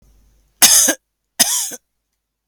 {"cough_length": "2.5 s", "cough_amplitude": 32768, "cough_signal_mean_std_ratio": 0.37, "survey_phase": "alpha (2021-03-01 to 2021-08-12)", "age": "45-64", "gender": "Female", "wearing_mask": "No", "symptom_none": true, "smoker_status": "Ex-smoker", "respiratory_condition_asthma": true, "respiratory_condition_other": false, "recruitment_source": "REACT", "submission_delay": "2 days", "covid_test_result": "Negative", "covid_test_method": "RT-qPCR"}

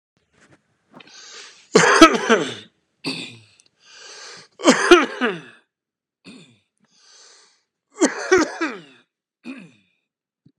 {"three_cough_length": "10.6 s", "three_cough_amplitude": 32768, "three_cough_signal_mean_std_ratio": 0.31, "survey_phase": "beta (2021-08-13 to 2022-03-07)", "age": "45-64", "gender": "Male", "wearing_mask": "No", "symptom_cough_any": true, "symptom_runny_or_blocked_nose": true, "symptom_onset": "6 days", "smoker_status": "Never smoked", "respiratory_condition_asthma": false, "respiratory_condition_other": false, "recruitment_source": "REACT", "submission_delay": "2 days", "covid_test_result": "Negative", "covid_test_method": "RT-qPCR", "influenza_a_test_result": "Negative", "influenza_b_test_result": "Negative"}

